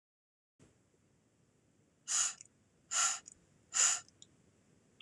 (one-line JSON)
{"exhalation_length": "5.0 s", "exhalation_amplitude": 4521, "exhalation_signal_mean_std_ratio": 0.32, "survey_phase": "alpha (2021-03-01 to 2021-08-12)", "age": "18-44", "gender": "Male", "wearing_mask": "No", "symptom_none": true, "smoker_status": "Never smoked", "respiratory_condition_asthma": true, "respiratory_condition_other": false, "recruitment_source": "REACT", "submission_delay": "2 days", "covid_test_result": "Negative", "covid_test_method": "RT-qPCR"}